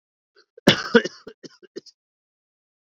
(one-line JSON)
{"cough_length": "2.8 s", "cough_amplitude": 32768, "cough_signal_mean_std_ratio": 0.21, "survey_phase": "beta (2021-08-13 to 2022-03-07)", "age": "45-64", "gender": "Male", "wearing_mask": "No", "symptom_cough_any": true, "symptom_headache": true, "symptom_onset": "5 days", "smoker_status": "Never smoked", "respiratory_condition_asthma": false, "respiratory_condition_other": false, "recruitment_source": "Test and Trace", "submission_delay": "1 day", "covid_test_result": "Positive", "covid_test_method": "RT-qPCR"}